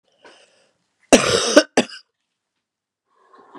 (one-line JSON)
{"cough_length": "3.6 s", "cough_amplitude": 32768, "cough_signal_mean_std_ratio": 0.27, "survey_phase": "beta (2021-08-13 to 2022-03-07)", "age": "65+", "gender": "Female", "wearing_mask": "No", "symptom_cough_any": true, "symptom_runny_or_blocked_nose": true, "symptom_fatigue": true, "symptom_loss_of_taste": true, "symptom_onset": "2 days", "smoker_status": "Never smoked", "respiratory_condition_asthma": false, "respiratory_condition_other": false, "recruitment_source": "Test and Trace", "submission_delay": "1 day", "covid_test_result": "Positive", "covid_test_method": "RT-qPCR"}